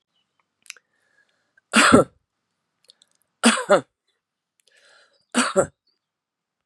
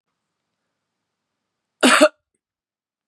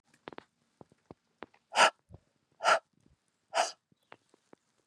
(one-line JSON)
{"three_cough_length": "6.7 s", "three_cough_amplitude": 31933, "three_cough_signal_mean_std_ratio": 0.27, "cough_length": "3.1 s", "cough_amplitude": 31968, "cough_signal_mean_std_ratio": 0.22, "exhalation_length": "4.9 s", "exhalation_amplitude": 11093, "exhalation_signal_mean_std_ratio": 0.23, "survey_phase": "beta (2021-08-13 to 2022-03-07)", "age": "45-64", "gender": "Female", "wearing_mask": "No", "symptom_cough_any": true, "symptom_runny_or_blocked_nose": true, "symptom_diarrhoea": true, "symptom_fatigue": true, "symptom_other": true, "symptom_onset": "4 days", "smoker_status": "Never smoked", "respiratory_condition_asthma": false, "respiratory_condition_other": false, "recruitment_source": "Test and Trace", "submission_delay": "2 days", "covid_test_result": "Positive", "covid_test_method": "RT-qPCR", "covid_ct_value": 19.0, "covid_ct_gene": "N gene", "covid_ct_mean": 19.8, "covid_viral_load": "330000 copies/ml", "covid_viral_load_category": "Low viral load (10K-1M copies/ml)"}